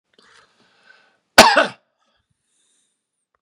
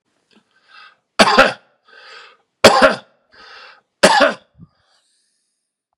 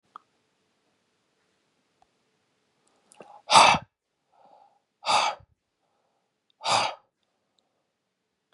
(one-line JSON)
{"cough_length": "3.4 s", "cough_amplitude": 32768, "cough_signal_mean_std_ratio": 0.21, "three_cough_length": "6.0 s", "three_cough_amplitude": 32768, "three_cough_signal_mean_std_ratio": 0.31, "exhalation_length": "8.5 s", "exhalation_amplitude": 29332, "exhalation_signal_mean_std_ratio": 0.22, "survey_phase": "beta (2021-08-13 to 2022-03-07)", "age": "45-64", "gender": "Male", "wearing_mask": "No", "symptom_none": true, "smoker_status": "Ex-smoker", "respiratory_condition_asthma": false, "respiratory_condition_other": false, "recruitment_source": "REACT", "submission_delay": "4 days", "covid_test_result": "Negative", "covid_test_method": "RT-qPCR", "influenza_a_test_result": "Negative", "influenza_b_test_result": "Negative"}